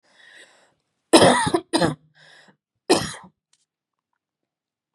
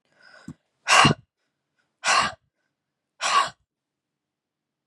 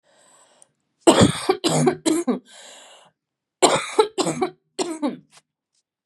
{"three_cough_length": "4.9 s", "three_cough_amplitude": 32767, "three_cough_signal_mean_std_ratio": 0.3, "exhalation_length": "4.9 s", "exhalation_amplitude": 26123, "exhalation_signal_mean_std_ratio": 0.31, "cough_length": "6.1 s", "cough_amplitude": 32687, "cough_signal_mean_std_ratio": 0.42, "survey_phase": "beta (2021-08-13 to 2022-03-07)", "age": "18-44", "gender": "Female", "wearing_mask": "No", "symptom_none": true, "smoker_status": "Never smoked", "respiratory_condition_asthma": false, "respiratory_condition_other": false, "recruitment_source": "REACT", "submission_delay": "2 days", "covid_test_result": "Negative", "covid_test_method": "RT-qPCR", "influenza_a_test_result": "Negative", "influenza_b_test_result": "Negative"}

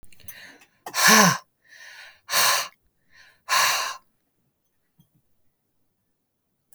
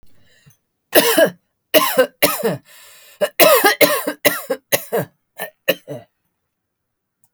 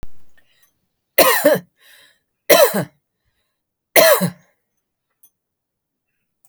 {"exhalation_length": "6.7 s", "exhalation_amplitude": 27360, "exhalation_signal_mean_std_ratio": 0.34, "cough_length": "7.3 s", "cough_amplitude": 32768, "cough_signal_mean_std_ratio": 0.42, "three_cough_length": "6.5 s", "three_cough_amplitude": 32768, "three_cough_signal_mean_std_ratio": 0.33, "survey_phase": "alpha (2021-03-01 to 2021-08-12)", "age": "45-64", "gender": "Female", "wearing_mask": "No", "symptom_headache": true, "smoker_status": "Ex-smoker", "respiratory_condition_asthma": false, "respiratory_condition_other": false, "recruitment_source": "REACT", "submission_delay": "2 days", "covid_test_result": "Negative", "covid_test_method": "RT-qPCR"}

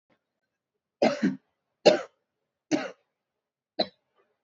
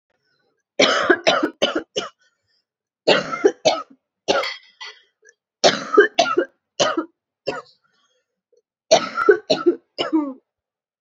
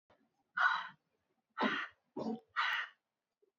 {"three_cough_length": "4.4 s", "three_cough_amplitude": 19049, "three_cough_signal_mean_std_ratio": 0.26, "cough_length": "11.0 s", "cough_amplitude": 29525, "cough_signal_mean_std_ratio": 0.4, "exhalation_length": "3.6 s", "exhalation_amplitude": 3869, "exhalation_signal_mean_std_ratio": 0.44, "survey_phase": "alpha (2021-03-01 to 2021-08-12)", "age": "18-44", "gender": "Female", "wearing_mask": "No", "symptom_cough_any": true, "symptom_fatigue": true, "symptom_fever_high_temperature": true, "symptom_headache": true, "symptom_onset": "6 days", "smoker_status": "Never smoked", "respiratory_condition_asthma": true, "respiratory_condition_other": false, "recruitment_source": "Test and Trace", "submission_delay": "1 day", "covid_test_result": "Positive", "covid_test_method": "RT-qPCR", "covid_ct_value": 16.7, "covid_ct_gene": "ORF1ab gene", "covid_ct_mean": 17.5, "covid_viral_load": "1800000 copies/ml", "covid_viral_load_category": "High viral load (>1M copies/ml)"}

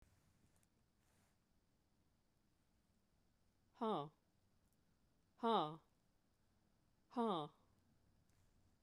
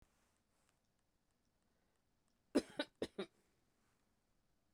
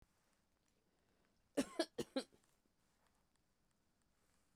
{"exhalation_length": "8.8 s", "exhalation_amplitude": 1612, "exhalation_signal_mean_std_ratio": 0.26, "cough_length": "4.7 s", "cough_amplitude": 2438, "cough_signal_mean_std_ratio": 0.17, "three_cough_length": "4.6 s", "three_cough_amplitude": 2372, "three_cough_signal_mean_std_ratio": 0.2, "survey_phase": "beta (2021-08-13 to 2022-03-07)", "age": "65+", "gender": "Female", "wearing_mask": "No", "symptom_none": true, "smoker_status": "Never smoked", "respiratory_condition_asthma": false, "respiratory_condition_other": false, "recruitment_source": "REACT", "submission_delay": "2 days", "covid_test_result": "Negative", "covid_test_method": "RT-qPCR", "influenza_a_test_result": "Unknown/Void", "influenza_b_test_result": "Unknown/Void"}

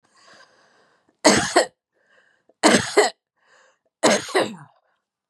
{"three_cough_length": "5.3 s", "three_cough_amplitude": 31220, "three_cough_signal_mean_std_ratio": 0.35, "survey_phase": "beta (2021-08-13 to 2022-03-07)", "age": "45-64", "gender": "Female", "wearing_mask": "No", "symptom_none": true, "symptom_onset": "7 days", "smoker_status": "Ex-smoker", "respiratory_condition_asthma": true, "respiratory_condition_other": false, "recruitment_source": "REACT", "submission_delay": "1 day", "covid_test_result": "Negative", "covid_test_method": "RT-qPCR", "influenza_a_test_result": "Negative", "influenza_b_test_result": "Negative"}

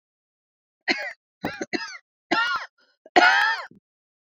{"cough_length": "4.3 s", "cough_amplitude": 27704, "cough_signal_mean_std_ratio": 0.39, "survey_phase": "beta (2021-08-13 to 2022-03-07)", "age": "45-64", "gender": "Female", "wearing_mask": "No", "symptom_cough_any": true, "symptom_fatigue": true, "symptom_headache": true, "symptom_change_to_sense_of_smell_or_taste": true, "symptom_loss_of_taste": true, "symptom_onset": "5 days", "smoker_status": "Never smoked", "respiratory_condition_asthma": false, "respiratory_condition_other": false, "recruitment_source": "Test and Trace", "submission_delay": "1 day", "covid_test_result": "Positive", "covid_test_method": "RT-qPCR", "covid_ct_value": 19.4, "covid_ct_gene": "ORF1ab gene"}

